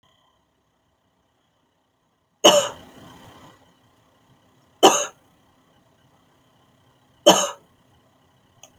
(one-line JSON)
{"three_cough_length": "8.8 s", "three_cough_amplitude": 32768, "three_cough_signal_mean_std_ratio": 0.21, "survey_phase": "beta (2021-08-13 to 2022-03-07)", "age": "45-64", "gender": "Female", "wearing_mask": "No", "symptom_none": true, "smoker_status": "Ex-smoker", "respiratory_condition_asthma": false, "respiratory_condition_other": false, "recruitment_source": "Test and Trace", "submission_delay": "2 days", "covid_test_result": "Negative", "covid_test_method": "RT-qPCR"}